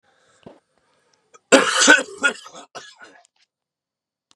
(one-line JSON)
{"cough_length": "4.4 s", "cough_amplitude": 32768, "cough_signal_mean_std_ratio": 0.29, "survey_phase": "beta (2021-08-13 to 2022-03-07)", "age": "18-44", "gender": "Male", "wearing_mask": "No", "symptom_cough_any": true, "symptom_fatigue": true, "symptom_headache": true, "symptom_other": true, "symptom_onset": "2 days", "smoker_status": "Never smoked", "respiratory_condition_asthma": false, "respiratory_condition_other": false, "recruitment_source": "Test and Trace", "submission_delay": "1 day", "covid_test_result": "Positive", "covid_test_method": "RT-qPCR", "covid_ct_value": 23.0, "covid_ct_gene": "ORF1ab gene"}